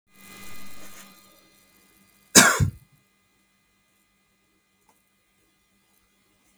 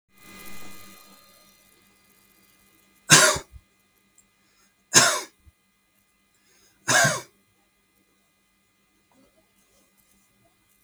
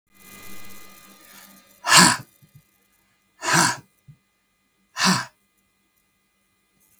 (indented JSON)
{
  "cough_length": "6.6 s",
  "cough_amplitude": 32766,
  "cough_signal_mean_std_ratio": 0.21,
  "three_cough_length": "10.8 s",
  "three_cough_amplitude": 32766,
  "three_cough_signal_mean_std_ratio": 0.23,
  "exhalation_length": "7.0 s",
  "exhalation_amplitude": 32768,
  "exhalation_signal_mean_std_ratio": 0.29,
  "survey_phase": "beta (2021-08-13 to 2022-03-07)",
  "age": "45-64",
  "gender": "Male",
  "wearing_mask": "No",
  "symptom_none": true,
  "smoker_status": "Never smoked",
  "respiratory_condition_asthma": false,
  "respiratory_condition_other": false,
  "recruitment_source": "REACT",
  "submission_delay": "2 days",
  "covid_test_result": "Negative",
  "covid_test_method": "RT-qPCR",
  "influenza_a_test_result": "Negative",
  "influenza_b_test_result": "Negative"
}